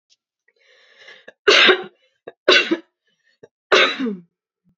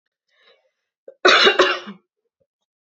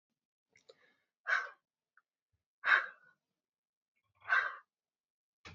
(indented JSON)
{
  "three_cough_length": "4.8 s",
  "three_cough_amplitude": 32768,
  "three_cough_signal_mean_std_ratio": 0.35,
  "cough_length": "2.8 s",
  "cough_amplitude": 28630,
  "cough_signal_mean_std_ratio": 0.33,
  "exhalation_length": "5.5 s",
  "exhalation_amplitude": 6518,
  "exhalation_signal_mean_std_ratio": 0.25,
  "survey_phase": "alpha (2021-03-01 to 2021-08-12)",
  "age": "18-44",
  "gender": "Female",
  "wearing_mask": "No",
  "symptom_cough_any": true,
  "symptom_fatigue": true,
  "symptom_onset": "13 days",
  "smoker_status": "Ex-smoker",
  "respiratory_condition_asthma": true,
  "respiratory_condition_other": false,
  "recruitment_source": "REACT",
  "submission_delay": "1 day",
  "covid_test_result": "Negative",
  "covid_test_method": "RT-qPCR"
}